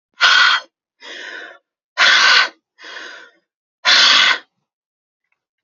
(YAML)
exhalation_length: 5.6 s
exhalation_amplitude: 32767
exhalation_signal_mean_std_ratio: 0.45
survey_phase: beta (2021-08-13 to 2022-03-07)
age: 18-44
gender: Female
wearing_mask: 'No'
symptom_runny_or_blocked_nose: true
smoker_status: Ex-smoker
respiratory_condition_asthma: false
respiratory_condition_other: false
recruitment_source: REACT
submission_delay: 1 day
covid_test_result: Negative
covid_test_method: RT-qPCR
influenza_a_test_result: Negative
influenza_b_test_result: Negative